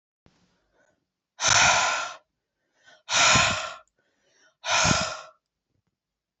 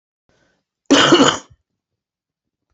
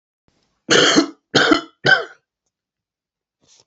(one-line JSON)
{"exhalation_length": "6.4 s", "exhalation_amplitude": 18739, "exhalation_signal_mean_std_ratio": 0.42, "cough_length": "2.7 s", "cough_amplitude": 32100, "cough_signal_mean_std_ratio": 0.33, "three_cough_length": "3.7 s", "three_cough_amplitude": 31322, "three_cough_signal_mean_std_ratio": 0.37, "survey_phase": "beta (2021-08-13 to 2022-03-07)", "age": "18-44", "gender": "Male", "wearing_mask": "No", "symptom_runny_or_blocked_nose": true, "symptom_fatigue": true, "symptom_fever_high_temperature": true, "symptom_headache": true, "symptom_onset": "3 days", "smoker_status": "Ex-smoker", "respiratory_condition_asthma": false, "respiratory_condition_other": false, "recruitment_source": "Test and Trace", "submission_delay": "1 day", "covid_test_result": "Positive", "covid_test_method": "RT-qPCR", "covid_ct_value": 16.1, "covid_ct_gene": "ORF1ab gene", "covid_ct_mean": 16.2, "covid_viral_load": "4700000 copies/ml", "covid_viral_load_category": "High viral load (>1M copies/ml)"}